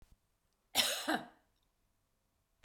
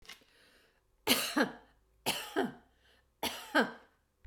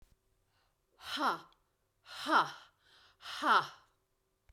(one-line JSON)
{"cough_length": "2.6 s", "cough_amplitude": 5234, "cough_signal_mean_std_ratio": 0.31, "three_cough_length": "4.3 s", "three_cough_amplitude": 9608, "three_cough_signal_mean_std_ratio": 0.39, "exhalation_length": "4.5 s", "exhalation_amplitude": 5506, "exhalation_signal_mean_std_ratio": 0.34, "survey_phase": "beta (2021-08-13 to 2022-03-07)", "age": "65+", "gender": "Female", "wearing_mask": "No", "symptom_none": true, "smoker_status": "Never smoked", "respiratory_condition_asthma": false, "respiratory_condition_other": false, "recruitment_source": "REACT", "submission_delay": "2 days", "covid_test_result": "Negative", "covid_test_method": "RT-qPCR"}